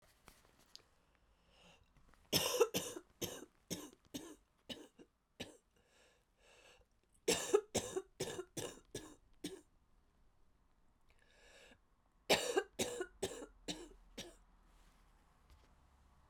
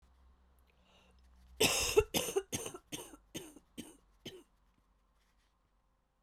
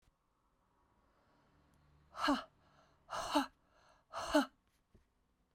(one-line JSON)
{"three_cough_length": "16.3 s", "three_cough_amplitude": 4370, "three_cough_signal_mean_std_ratio": 0.32, "cough_length": "6.2 s", "cough_amplitude": 6668, "cough_signal_mean_std_ratio": 0.31, "exhalation_length": "5.5 s", "exhalation_amplitude": 3791, "exhalation_signal_mean_std_ratio": 0.3, "survey_phase": "beta (2021-08-13 to 2022-03-07)", "age": "18-44", "gender": "Female", "wearing_mask": "No", "symptom_cough_any": true, "symptom_new_continuous_cough": true, "symptom_runny_or_blocked_nose": true, "symptom_fatigue": true, "symptom_fever_high_temperature": true, "symptom_headache": true, "symptom_other": true, "symptom_onset": "4 days", "smoker_status": "Never smoked", "respiratory_condition_asthma": false, "respiratory_condition_other": false, "recruitment_source": "Test and Trace", "submission_delay": "1 day", "covid_test_result": "Positive", "covid_test_method": "RT-qPCR"}